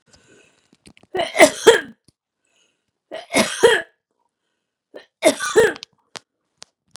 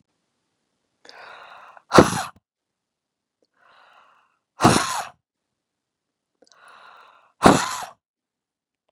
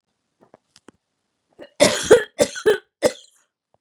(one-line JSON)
{"three_cough_length": "7.0 s", "three_cough_amplitude": 32768, "three_cough_signal_mean_std_ratio": 0.3, "exhalation_length": "8.9 s", "exhalation_amplitude": 32768, "exhalation_signal_mean_std_ratio": 0.22, "cough_length": "3.8 s", "cough_amplitude": 30317, "cough_signal_mean_std_ratio": 0.3, "survey_phase": "beta (2021-08-13 to 2022-03-07)", "age": "45-64", "gender": "Female", "wearing_mask": "No", "symptom_none": true, "smoker_status": "Never smoked", "respiratory_condition_asthma": false, "respiratory_condition_other": false, "recruitment_source": "REACT", "submission_delay": "2 days", "covid_test_result": "Negative", "covid_test_method": "RT-qPCR"}